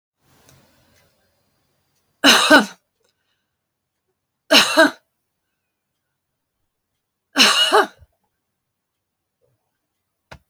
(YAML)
three_cough_length: 10.5 s
three_cough_amplitude: 32768
three_cough_signal_mean_std_ratio: 0.27
survey_phase: beta (2021-08-13 to 2022-03-07)
age: 65+
gender: Female
wearing_mask: 'No'
symptom_none: true
smoker_status: Never smoked
respiratory_condition_asthma: false
respiratory_condition_other: false
recruitment_source: REACT
submission_delay: 1 day
covid_test_result: Negative
covid_test_method: RT-qPCR